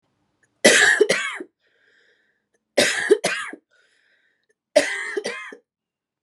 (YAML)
three_cough_length: 6.2 s
three_cough_amplitude: 30544
three_cough_signal_mean_std_ratio: 0.38
survey_phase: beta (2021-08-13 to 2022-03-07)
age: 45-64
gender: Female
wearing_mask: 'No'
symptom_runny_or_blocked_nose: true
symptom_shortness_of_breath: true
symptom_sore_throat: true
symptom_fatigue: true
symptom_fever_high_temperature: true
symptom_headache: true
smoker_status: Ex-smoker
respiratory_condition_asthma: true
respiratory_condition_other: false
recruitment_source: Test and Trace
submission_delay: 2 days
covid_test_result: Positive
covid_test_method: RT-qPCR